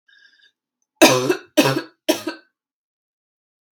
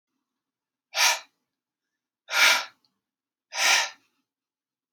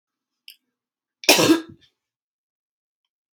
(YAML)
three_cough_length: 3.7 s
three_cough_amplitude: 32768
three_cough_signal_mean_std_ratio: 0.31
exhalation_length: 4.9 s
exhalation_amplitude: 18616
exhalation_signal_mean_std_ratio: 0.33
cough_length: 3.3 s
cough_amplitude: 32768
cough_signal_mean_std_ratio: 0.24
survey_phase: beta (2021-08-13 to 2022-03-07)
age: 18-44
gender: Female
wearing_mask: 'No'
symptom_none: true
symptom_onset: 12 days
smoker_status: Never smoked
respiratory_condition_asthma: true
respiratory_condition_other: false
recruitment_source: REACT
submission_delay: 2 days
covid_test_result: Negative
covid_test_method: RT-qPCR